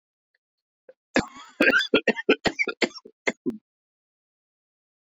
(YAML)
cough_length: 5.0 s
cough_amplitude: 15858
cough_signal_mean_std_ratio: 0.32
survey_phase: beta (2021-08-13 to 2022-03-07)
age: 18-44
gender: Male
wearing_mask: 'No'
symptom_cough_any: true
symptom_runny_or_blocked_nose: true
symptom_sore_throat: true
symptom_fatigue: true
symptom_onset: 2 days
smoker_status: Current smoker (e-cigarettes or vapes only)
respiratory_condition_asthma: false
respiratory_condition_other: false
recruitment_source: Test and Trace
submission_delay: 1 day
covid_test_result: Positive
covid_test_method: RT-qPCR